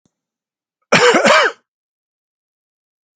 {"cough_length": "3.2 s", "cough_amplitude": 32768, "cough_signal_mean_std_ratio": 0.35, "survey_phase": "alpha (2021-03-01 to 2021-08-12)", "age": "45-64", "gender": "Male", "wearing_mask": "No", "symptom_none": true, "smoker_status": "Never smoked", "respiratory_condition_asthma": false, "respiratory_condition_other": false, "recruitment_source": "Test and Trace", "submission_delay": "1 day", "covid_test_result": "Positive", "covid_test_method": "RT-qPCR"}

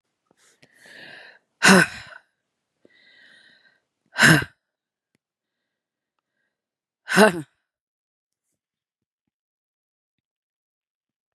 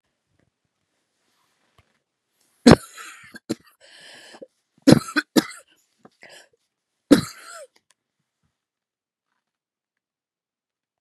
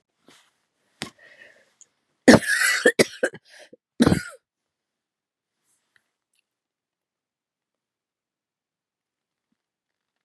{"exhalation_length": "11.3 s", "exhalation_amplitude": 31418, "exhalation_signal_mean_std_ratio": 0.2, "three_cough_length": "11.0 s", "three_cough_amplitude": 32768, "three_cough_signal_mean_std_ratio": 0.16, "cough_length": "10.2 s", "cough_amplitude": 32767, "cough_signal_mean_std_ratio": 0.2, "survey_phase": "beta (2021-08-13 to 2022-03-07)", "age": "45-64", "gender": "Female", "wearing_mask": "No", "symptom_cough_any": true, "symptom_new_continuous_cough": true, "symptom_runny_or_blocked_nose": true, "symptom_shortness_of_breath": true, "symptom_sore_throat": true, "symptom_fatigue": true, "symptom_headache": true, "symptom_change_to_sense_of_smell_or_taste": true, "symptom_loss_of_taste": true, "symptom_onset": "3 days", "smoker_status": "Ex-smoker", "respiratory_condition_asthma": false, "respiratory_condition_other": false, "recruitment_source": "Test and Trace", "submission_delay": "1 day", "covid_test_result": "Positive", "covid_test_method": "RT-qPCR", "covid_ct_value": 19.2, "covid_ct_gene": "N gene", "covid_ct_mean": 19.4, "covid_viral_load": "420000 copies/ml", "covid_viral_load_category": "Low viral load (10K-1M copies/ml)"}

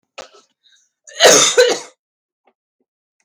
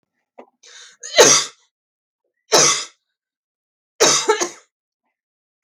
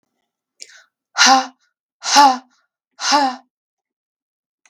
{"cough_length": "3.2 s", "cough_amplitude": 32768, "cough_signal_mean_std_ratio": 0.34, "three_cough_length": "5.6 s", "three_cough_amplitude": 32768, "three_cough_signal_mean_std_ratio": 0.33, "exhalation_length": "4.7 s", "exhalation_amplitude": 32768, "exhalation_signal_mean_std_ratio": 0.34, "survey_phase": "beta (2021-08-13 to 2022-03-07)", "age": "18-44", "gender": "Female", "wearing_mask": "No", "symptom_none": true, "smoker_status": "Never smoked", "respiratory_condition_asthma": false, "respiratory_condition_other": false, "recruitment_source": "REACT", "submission_delay": "2 days", "covid_test_result": "Negative", "covid_test_method": "RT-qPCR", "influenza_a_test_result": "Unknown/Void", "influenza_b_test_result": "Unknown/Void"}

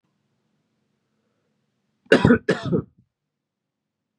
{"cough_length": "4.2 s", "cough_amplitude": 32174, "cough_signal_mean_std_ratio": 0.24, "survey_phase": "beta (2021-08-13 to 2022-03-07)", "age": "18-44", "gender": "Male", "wearing_mask": "No", "symptom_cough_any": true, "symptom_new_continuous_cough": true, "symptom_fatigue": true, "symptom_change_to_sense_of_smell_or_taste": true, "symptom_loss_of_taste": true, "symptom_onset": "6 days", "smoker_status": "Ex-smoker", "respiratory_condition_asthma": false, "respiratory_condition_other": false, "recruitment_source": "Test and Trace", "submission_delay": "1 day", "covid_test_result": "Positive", "covid_test_method": "RT-qPCR", "covid_ct_value": 17.2, "covid_ct_gene": "ORF1ab gene", "covid_ct_mean": 17.4, "covid_viral_load": "1900000 copies/ml", "covid_viral_load_category": "High viral load (>1M copies/ml)"}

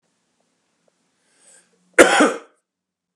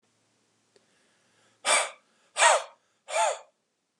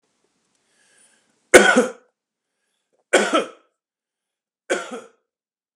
{"cough_length": "3.2 s", "cough_amplitude": 32768, "cough_signal_mean_std_ratio": 0.24, "exhalation_length": "4.0 s", "exhalation_amplitude": 15768, "exhalation_signal_mean_std_ratio": 0.33, "three_cough_length": "5.8 s", "three_cough_amplitude": 32768, "three_cough_signal_mean_std_ratio": 0.26, "survey_phase": "beta (2021-08-13 to 2022-03-07)", "age": "45-64", "gender": "Male", "wearing_mask": "No", "symptom_none": true, "smoker_status": "Never smoked", "respiratory_condition_asthma": false, "respiratory_condition_other": false, "recruitment_source": "REACT", "submission_delay": "1 day", "covid_test_result": "Negative", "covid_test_method": "RT-qPCR", "influenza_a_test_result": "Negative", "influenza_b_test_result": "Negative"}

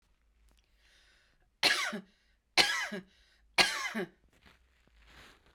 {"three_cough_length": "5.5 s", "three_cough_amplitude": 12878, "three_cough_signal_mean_std_ratio": 0.33, "survey_phase": "beta (2021-08-13 to 2022-03-07)", "age": "45-64", "gender": "Female", "wearing_mask": "No", "symptom_none": true, "smoker_status": "Never smoked", "respiratory_condition_asthma": false, "respiratory_condition_other": false, "recruitment_source": "REACT", "submission_delay": "1 day", "covid_test_result": "Negative", "covid_test_method": "RT-qPCR", "influenza_a_test_result": "Negative", "influenza_b_test_result": "Negative"}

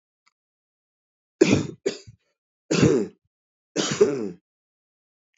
{"three_cough_length": "5.4 s", "three_cough_amplitude": 25199, "three_cough_signal_mean_std_ratio": 0.34, "survey_phase": "beta (2021-08-13 to 2022-03-07)", "age": "45-64", "gender": "Male", "wearing_mask": "No", "symptom_cough_any": true, "symptom_new_continuous_cough": true, "symptom_sore_throat": true, "symptom_headache": true, "smoker_status": "Ex-smoker", "respiratory_condition_asthma": false, "respiratory_condition_other": false, "recruitment_source": "Test and Trace", "submission_delay": "2 days", "covid_test_result": "Positive", "covid_test_method": "RT-qPCR", "covid_ct_value": 20.3, "covid_ct_gene": "ORF1ab gene", "covid_ct_mean": 20.5, "covid_viral_load": "190000 copies/ml", "covid_viral_load_category": "Low viral load (10K-1M copies/ml)"}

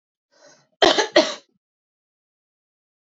{"cough_length": "3.1 s", "cough_amplitude": 29426, "cough_signal_mean_std_ratio": 0.25, "survey_phase": "beta (2021-08-13 to 2022-03-07)", "age": "18-44", "gender": "Female", "wearing_mask": "No", "symptom_runny_or_blocked_nose": true, "symptom_fatigue": true, "symptom_headache": true, "symptom_other": true, "symptom_onset": "2 days", "smoker_status": "Never smoked", "respiratory_condition_asthma": false, "respiratory_condition_other": false, "recruitment_source": "Test and Trace", "submission_delay": "1 day", "covid_test_result": "Positive", "covid_test_method": "RT-qPCR", "covid_ct_value": 27.8, "covid_ct_gene": "ORF1ab gene", "covid_ct_mean": 28.2, "covid_viral_load": "570 copies/ml", "covid_viral_load_category": "Minimal viral load (< 10K copies/ml)"}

